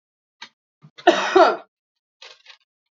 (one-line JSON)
{"cough_length": "3.0 s", "cough_amplitude": 30423, "cough_signal_mean_std_ratio": 0.29, "survey_phase": "beta (2021-08-13 to 2022-03-07)", "age": "18-44", "gender": "Female", "wearing_mask": "No", "symptom_none": true, "smoker_status": "Ex-smoker", "respiratory_condition_asthma": false, "respiratory_condition_other": false, "recruitment_source": "Test and Trace", "submission_delay": "2 days", "covid_test_result": "Positive", "covid_test_method": "LFT"}